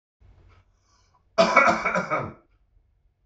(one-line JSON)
{"cough_length": "3.3 s", "cough_amplitude": 24217, "cough_signal_mean_std_ratio": 0.38, "survey_phase": "beta (2021-08-13 to 2022-03-07)", "age": "45-64", "gender": "Male", "wearing_mask": "No", "symptom_cough_any": true, "symptom_runny_or_blocked_nose": true, "symptom_sore_throat": true, "symptom_onset": "2 days", "smoker_status": "Ex-smoker", "respiratory_condition_asthma": false, "respiratory_condition_other": false, "recruitment_source": "Test and Trace", "submission_delay": "1 day", "covid_test_result": "Negative", "covid_test_method": "ePCR"}